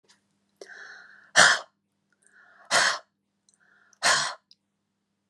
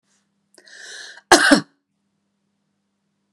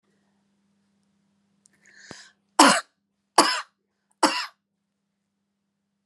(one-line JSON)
{"exhalation_length": "5.3 s", "exhalation_amplitude": 27169, "exhalation_signal_mean_std_ratio": 0.3, "cough_length": "3.3 s", "cough_amplitude": 32768, "cough_signal_mean_std_ratio": 0.23, "three_cough_length": "6.1 s", "three_cough_amplitude": 31903, "three_cough_signal_mean_std_ratio": 0.22, "survey_phase": "beta (2021-08-13 to 2022-03-07)", "age": "45-64", "gender": "Female", "wearing_mask": "No", "symptom_none": true, "smoker_status": "Never smoked", "respiratory_condition_asthma": false, "respiratory_condition_other": false, "recruitment_source": "REACT", "submission_delay": "3 days", "covid_test_result": "Negative", "covid_test_method": "RT-qPCR", "influenza_a_test_result": "Negative", "influenza_b_test_result": "Negative"}